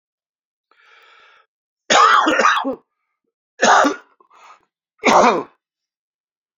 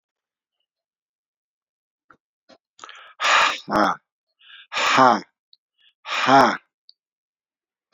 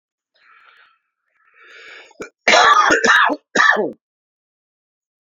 {"three_cough_length": "6.6 s", "three_cough_amplitude": 31272, "three_cough_signal_mean_std_ratio": 0.4, "exhalation_length": "7.9 s", "exhalation_amplitude": 27847, "exhalation_signal_mean_std_ratio": 0.33, "cough_length": "5.2 s", "cough_amplitude": 32686, "cough_signal_mean_std_ratio": 0.41, "survey_phase": "alpha (2021-03-01 to 2021-08-12)", "age": "45-64", "gender": "Male", "wearing_mask": "No", "symptom_cough_any": true, "symptom_shortness_of_breath": true, "symptom_diarrhoea": true, "symptom_fatigue": true, "symptom_loss_of_taste": true, "symptom_onset": "4 days", "smoker_status": "Never smoked", "respiratory_condition_asthma": false, "respiratory_condition_other": false, "recruitment_source": "Test and Trace", "submission_delay": "2 days", "covid_test_result": "Positive", "covid_test_method": "RT-qPCR", "covid_ct_value": 17.9, "covid_ct_gene": "ORF1ab gene"}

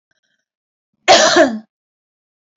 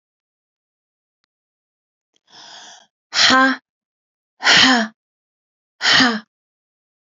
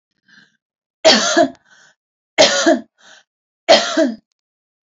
{"cough_length": "2.6 s", "cough_amplitude": 32767, "cough_signal_mean_std_ratio": 0.35, "exhalation_length": "7.2 s", "exhalation_amplitude": 32041, "exhalation_signal_mean_std_ratio": 0.33, "three_cough_length": "4.9 s", "three_cough_amplitude": 31525, "three_cough_signal_mean_std_ratio": 0.4, "survey_phase": "beta (2021-08-13 to 2022-03-07)", "age": "45-64", "gender": "Female", "wearing_mask": "No", "symptom_none": true, "smoker_status": "Ex-smoker", "respiratory_condition_asthma": false, "respiratory_condition_other": false, "recruitment_source": "REACT", "submission_delay": "1 day", "covid_test_result": "Negative", "covid_test_method": "RT-qPCR", "influenza_a_test_result": "Unknown/Void", "influenza_b_test_result": "Unknown/Void"}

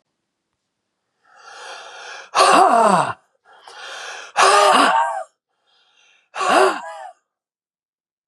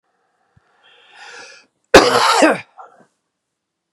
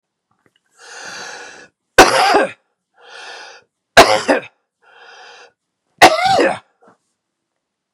{"exhalation_length": "8.3 s", "exhalation_amplitude": 31126, "exhalation_signal_mean_std_ratio": 0.43, "cough_length": "3.9 s", "cough_amplitude": 32768, "cough_signal_mean_std_ratio": 0.31, "three_cough_length": "7.9 s", "three_cough_amplitude": 32768, "three_cough_signal_mean_std_ratio": 0.33, "survey_phase": "beta (2021-08-13 to 2022-03-07)", "age": "45-64", "gender": "Male", "wearing_mask": "No", "symptom_diarrhoea": true, "symptom_headache": true, "symptom_onset": "6 days", "smoker_status": "Ex-smoker", "respiratory_condition_asthma": false, "respiratory_condition_other": false, "recruitment_source": "REACT", "submission_delay": "4 days", "covid_test_result": "Negative", "covid_test_method": "RT-qPCR"}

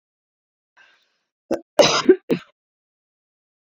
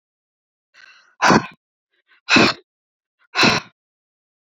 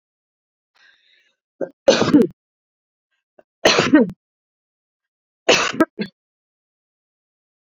{"cough_length": "3.8 s", "cough_amplitude": 28749, "cough_signal_mean_std_ratio": 0.24, "exhalation_length": "4.4 s", "exhalation_amplitude": 32441, "exhalation_signal_mean_std_ratio": 0.31, "three_cough_length": "7.7 s", "three_cough_amplitude": 28993, "three_cough_signal_mean_std_ratio": 0.29, "survey_phase": "beta (2021-08-13 to 2022-03-07)", "age": "45-64", "gender": "Female", "wearing_mask": "No", "symptom_none": true, "smoker_status": "Never smoked", "respiratory_condition_asthma": false, "respiratory_condition_other": false, "recruitment_source": "REACT", "submission_delay": "1 day", "covid_test_result": "Negative", "covid_test_method": "RT-qPCR"}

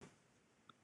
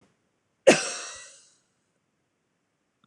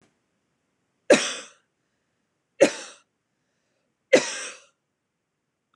{"exhalation_length": "0.8 s", "exhalation_amplitude": 242, "exhalation_signal_mean_std_ratio": 0.64, "cough_length": "3.1 s", "cough_amplitude": 25301, "cough_signal_mean_std_ratio": 0.2, "three_cough_length": "5.8 s", "three_cough_amplitude": 23220, "three_cough_signal_mean_std_ratio": 0.21, "survey_phase": "beta (2021-08-13 to 2022-03-07)", "age": "45-64", "gender": "Female", "wearing_mask": "No", "symptom_none": true, "smoker_status": "Ex-smoker", "respiratory_condition_asthma": false, "respiratory_condition_other": false, "recruitment_source": "REACT", "submission_delay": "1 day", "covid_test_result": "Negative", "covid_test_method": "RT-qPCR", "influenza_a_test_result": "Negative", "influenza_b_test_result": "Negative"}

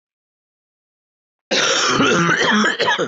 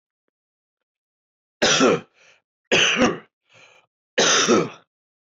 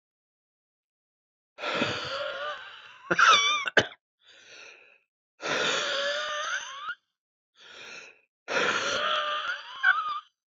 {"cough_length": "3.1 s", "cough_amplitude": 19917, "cough_signal_mean_std_ratio": 0.66, "three_cough_length": "5.4 s", "three_cough_amplitude": 17321, "three_cough_signal_mean_std_ratio": 0.42, "exhalation_length": "10.5 s", "exhalation_amplitude": 15853, "exhalation_signal_mean_std_ratio": 0.52, "survey_phase": "beta (2021-08-13 to 2022-03-07)", "age": "18-44", "gender": "Male", "wearing_mask": "No", "symptom_cough_any": true, "symptom_new_continuous_cough": true, "symptom_runny_or_blocked_nose": true, "symptom_fatigue": true, "symptom_fever_high_temperature": true, "symptom_headache": true, "symptom_change_to_sense_of_smell_or_taste": true, "symptom_loss_of_taste": true, "symptom_onset": "4 days", "smoker_status": "Never smoked", "respiratory_condition_asthma": false, "respiratory_condition_other": false, "recruitment_source": "Test and Trace", "submission_delay": "1 day", "covid_test_result": "Positive", "covid_test_method": "RT-qPCR"}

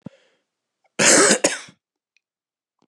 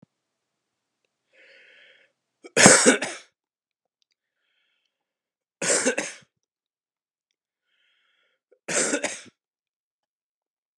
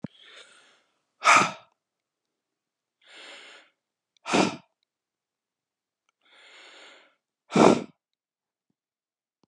{"cough_length": "2.9 s", "cough_amplitude": 27387, "cough_signal_mean_std_ratio": 0.34, "three_cough_length": "10.8 s", "three_cough_amplitude": 32767, "three_cough_signal_mean_std_ratio": 0.23, "exhalation_length": "9.5 s", "exhalation_amplitude": 25573, "exhalation_signal_mean_std_ratio": 0.22, "survey_phase": "beta (2021-08-13 to 2022-03-07)", "age": "65+", "gender": "Male", "wearing_mask": "No", "symptom_cough_any": true, "symptom_runny_or_blocked_nose": true, "symptom_fatigue": true, "symptom_onset": "3 days", "smoker_status": "Ex-smoker", "respiratory_condition_asthma": false, "respiratory_condition_other": false, "recruitment_source": "Test and Trace", "submission_delay": "1 day", "covid_test_result": "Positive", "covid_test_method": "ePCR"}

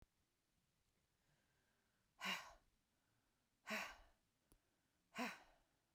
{"exhalation_length": "5.9 s", "exhalation_amplitude": 751, "exhalation_signal_mean_std_ratio": 0.3, "survey_phase": "beta (2021-08-13 to 2022-03-07)", "age": "45-64", "gender": "Female", "wearing_mask": "No", "symptom_cough_any": true, "symptom_fatigue": true, "symptom_fever_high_temperature": true, "symptom_onset": "3 days", "smoker_status": "Ex-smoker", "respiratory_condition_asthma": false, "respiratory_condition_other": false, "recruitment_source": "Test and Trace", "submission_delay": "2 days", "covid_test_result": "Positive", "covid_test_method": "RT-qPCR"}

